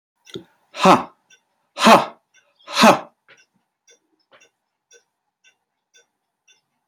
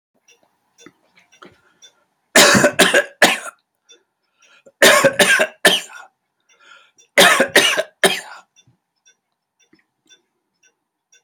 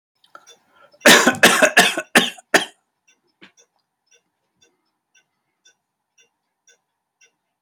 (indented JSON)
{
  "exhalation_length": "6.9 s",
  "exhalation_amplitude": 30081,
  "exhalation_signal_mean_std_ratio": 0.25,
  "three_cough_length": "11.2 s",
  "three_cough_amplitude": 32768,
  "three_cough_signal_mean_std_ratio": 0.35,
  "cough_length": "7.6 s",
  "cough_amplitude": 32768,
  "cough_signal_mean_std_ratio": 0.27,
  "survey_phase": "alpha (2021-03-01 to 2021-08-12)",
  "age": "65+",
  "gender": "Male",
  "wearing_mask": "No",
  "symptom_none": true,
  "smoker_status": "Never smoked",
  "respiratory_condition_asthma": false,
  "respiratory_condition_other": false,
  "recruitment_source": "REACT",
  "submission_delay": "2 days",
  "covid_test_result": "Negative",
  "covid_test_method": "RT-qPCR"
}